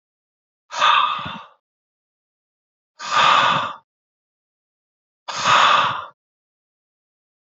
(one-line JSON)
{"exhalation_length": "7.5 s", "exhalation_amplitude": 25755, "exhalation_signal_mean_std_ratio": 0.4, "survey_phase": "beta (2021-08-13 to 2022-03-07)", "age": "45-64", "gender": "Male", "wearing_mask": "No", "symptom_none": true, "smoker_status": "Never smoked", "respiratory_condition_asthma": false, "respiratory_condition_other": false, "recruitment_source": "REACT", "submission_delay": "1 day", "covid_test_result": "Positive", "covid_test_method": "RT-qPCR", "covid_ct_value": 19.8, "covid_ct_gene": "E gene", "influenza_a_test_result": "Negative", "influenza_b_test_result": "Negative"}